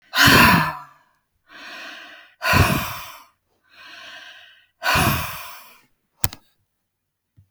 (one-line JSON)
{"exhalation_length": "7.5 s", "exhalation_amplitude": 32768, "exhalation_signal_mean_std_ratio": 0.38, "survey_phase": "beta (2021-08-13 to 2022-03-07)", "age": "45-64", "gender": "Female", "wearing_mask": "No", "symptom_none": true, "smoker_status": "Never smoked", "respiratory_condition_asthma": true, "respiratory_condition_other": false, "recruitment_source": "REACT", "submission_delay": "2 days", "covid_test_result": "Negative", "covid_test_method": "RT-qPCR"}